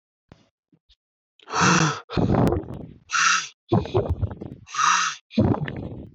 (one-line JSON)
{"exhalation_length": "6.1 s", "exhalation_amplitude": 16467, "exhalation_signal_mean_std_ratio": 0.57, "survey_phase": "alpha (2021-03-01 to 2021-08-12)", "age": "18-44", "gender": "Male", "wearing_mask": "No", "symptom_none": true, "smoker_status": "Never smoked", "respiratory_condition_asthma": false, "respiratory_condition_other": false, "recruitment_source": "REACT", "submission_delay": "2 days", "covid_test_result": "Negative", "covid_test_method": "RT-qPCR"}